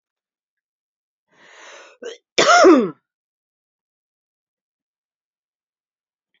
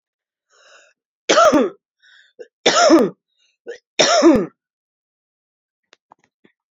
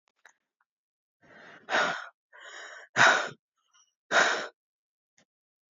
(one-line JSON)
{"cough_length": "6.4 s", "cough_amplitude": 29751, "cough_signal_mean_std_ratio": 0.23, "three_cough_length": "6.7 s", "three_cough_amplitude": 32414, "three_cough_signal_mean_std_ratio": 0.36, "exhalation_length": "5.7 s", "exhalation_amplitude": 15329, "exhalation_signal_mean_std_ratio": 0.32, "survey_phase": "beta (2021-08-13 to 2022-03-07)", "age": "45-64", "gender": "Female", "wearing_mask": "No", "symptom_sore_throat": true, "symptom_fatigue": true, "symptom_headache": true, "symptom_onset": "3 days", "smoker_status": "Current smoker (1 to 10 cigarettes per day)", "respiratory_condition_asthma": false, "respiratory_condition_other": false, "recruitment_source": "Test and Trace", "submission_delay": "2 days", "covid_test_result": "Positive", "covid_test_method": "RT-qPCR", "covid_ct_value": 25.2, "covid_ct_gene": "N gene"}